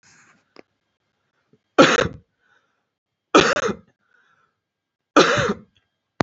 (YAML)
three_cough_length: 6.2 s
three_cough_amplitude: 28983
three_cough_signal_mean_std_ratio: 0.29
survey_phase: beta (2021-08-13 to 2022-03-07)
age: 18-44
gender: Male
wearing_mask: 'No'
symptom_none: true
smoker_status: Never smoked
respiratory_condition_asthma: false
respiratory_condition_other: false
recruitment_source: REACT
submission_delay: 3 days
covid_test_result: Negative
covid_test_method: RT-qPCR
influenza_a_test_result: Negative
influenza_b_test_result: Negative